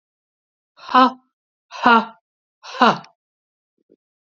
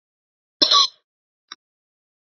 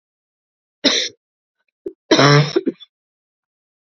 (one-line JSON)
{"exhalation_length": "4.3 s", "exhalation_amplitude": 32767, "exhalation_signal_mean_std_ratio": 0.28, "cough_length": "2.4 s", "cough_amplitude": 30100, "cough_signal_mean_std_ratio": 0.25, "three_cough_length": "3.9 s", "three_cough_amplitude": 31091, "three_cough_signal_mean_std_ratio": 0.33, "survey_phase": "beta (2021-08-13 to 2022-03-07)", "age": "45-64", "gender": "Female", "wearing_mask": "No", "symptom_cough_any": true, "symptom_headache": true, "symptom_onset": "2 days", "smoker_status": "Ex-smoker", "respiratory_condition_asthma": false, "respiratory_condition_other": false, "recruitment_source": "Test and Trace", "submission_delay": "2 days", "covid_test_result": "Positive", "covid_test_method": "RT-qPCR", "covid_ct_value": 24.1, "covid_ct_gene": "ORF1ab gene", "covid_ct_mean": 24.1, "covid_viral_load": "12000 copies/ml", "covid_viral_load_category": "Low viral load (10K-1M copies/ml)"}